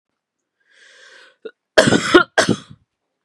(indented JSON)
{
  "cough_length": "3.2 s",
  "cough_amplitude": 32768,
  "cough_signal_mean_std_ratio": 0.31,
  "survey_phase": "beta (2021-08-13 to 2022-03-07)",
  "age": "18-44",
  "gender": "Female",
  "wearing_mask": "No",
  "symptom_cough_any": true,
  "symptom_runny_or_blocked_nose": true,
  "symptom_shortness_of_breath": true,
  "symptom_sore_throat": true,
  "symptom_headache": true,
  "smoker_status": "Never smoked",
  "respiratory_condition_asthma": false,
  "respiratory_condition_other": false,
  "recruitment_source": "Test and Trace",
  "submission_delay": "2 days",
  "covid_test_result": "Positive",
  "covid_test_method": "LFT"
}